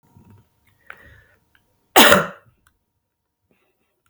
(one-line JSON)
{"cough_length": "4.1 s", "cough_amplitude": 32768, "cough_signal_mean_std_ratio": 0.22, "survey_phase": "beta (2021-08-13 to 2022-03-07)", "age": "18-44", "gender": "Female", "wearing_mask": "No", "symptom_runny_or_blocked_nose": true, "symptom_shortness_of_breath": true, "symptom_abdominal_pain": true, "symptom_diarrhoea": true, "symptom_fatigue": true, "symptom_headache": true, "symptom_onset": "3 days", "smoker_status": "Never smoked", "respiratory_condition_asthma": false, "respiratory_condition_other": false, "recruitment_source": "Test and Trace", "submission_delay": "1 day", "covid_test_result": "Positive", "covid_test_method": "RT-qPCR", "covid_ct_value": 33.2, "covid_ct_gene": "N gene"}